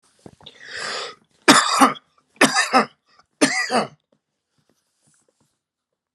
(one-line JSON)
{"three_cough_length": "6.1 s", "three_cough_amplitude": 32768, "three_cough_signal_mean_std_ratio": 0.35, "survey_phase": "alpha (2021-03-01 to 2021-08-12)", "age": "45-64", "gender": "Male", "wearing_mask": "No", "symptom_none": true, "smoker_status": "Ex-smoker", "respiratory_condition_asthma": false, "respiratory_condition_other": false, "recruitment_source": "REACT", "submission_delay": "2 days", "covid_test_result": "Negative", "covid_test_method": "RT-qPCR"}